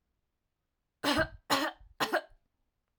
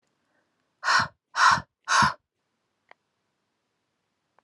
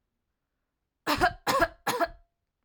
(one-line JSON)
{"three_cough_length": "3.0 s", "three_cough_amplitude": 6535, "three_cough_signal_mean_std_ratio": 0.37, "exhalation_length": "4.4 s", "exhalation_amplitude": 16212, "exhalation_signal_mean_std_ratio": 0.31, "cough_length": "2.6 s", "cough_amplitude": 9844, "cough_signal_mean_std_ratio": 0.39, "survey_phase": "alpha (2021-03-01 to 2021-08-12)", "age": "18-44", "gender": "Female", "wearing_mask": "No", "symptom_none": true, "symptom_onset": "10 days", "smoker_status": "Never smoked", "respiratory_condition_asthma": false, "respiratory_condition_other": false, "recruitment_source": "REACT", "submission_delay": "2 days", "covid_test_result": "Negative", "covid_test_method": "RT-qPCR"}